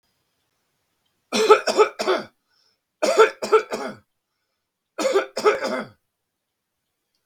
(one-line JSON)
{"three_cough_length": "7.3 s", "three_cough_amplitude": 32768, "three_cough_signal_mean_std_ratio": 0.37, "survey_phase": "beta (2021-08-13 to 2022-03-07)", "age": "45-64", "gender": "Male", "wearing_mask": "No", "symptom_none": true, "smoker_status": "Current smoker (11 or more cigarettes per day)", "respiratory_condition_asthma": false, "respiratory_condition_other": false, "recruitment_source": "REACT", "submission_delay": "1 day", "covid_test_result": "Negative", "covid_test_method": "RT-qPCR", "influenza_a_test_result": "Unknown/Void", "influenza_b_test_result": "Unknown/Void"}